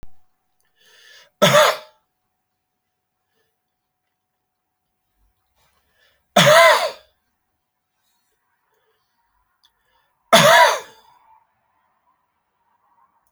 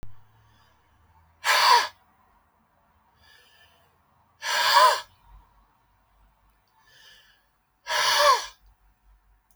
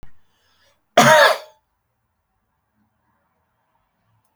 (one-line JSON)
{"three_cough_length": "13.3 s", "three_cough_amplitude": 32768, "three_cough_signal_mean_std_ratio": 0.26, "exhalation_length": "9.6 s", "exhalation_amplitude": 19318, "exhalation_signal_mean_std_ratio": 0.33, "cough_length": "4.4 s", "cough_amplitude": 32768, "cough_signal_mean_std_ratio": 0.25, "survey_phase": "beta (2021-08-13 to 2022-03-07)", "age": "65+", "gender": "Male", "wearing_mask": "No", "symptom_none": true, "smoker_status": "Ex-smoker", "respiratory_condition_asthma": false, "respiratory_condition_other": false, "recruitment_source": "REACT", "submission_delay": "1 day", "covid_test_result": "Negative", "covid_test_method": "RT-qPCR"}